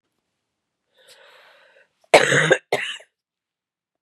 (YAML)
cough_length: 4.0 s
cough_amplitude: 32768
cough_signal_mean_std_ratio: 0.27
survey_phase: beta (2021-08-13 to 2022-03-07)
age: 45-64
gender: Female
wearing_mask: 'No'
symptom_cough_any: true
symptom_runny_or_blocked_nose: true
symptom_sore_throat: true
symptom_abdominal_pain: true
symptom_fatigue: true
symptom_headache: true
symptom_onset: 3 days
smoker_status: Never smoked
respiratory_condition_asthma: true
respiratory_condition_other: false
recruitment_source: Test and Trace
submission_delay: 1 day
covid_test_result: Positive
covid_test_method: RT-qPCR
covid_ct_value: 17.1
covid_ct_gene: N gene
covid_ct_mean: 17.8
covid_viral_load: 1500000 copies/ml
covid_viral_load_category: High viral load (>1M copies/ml)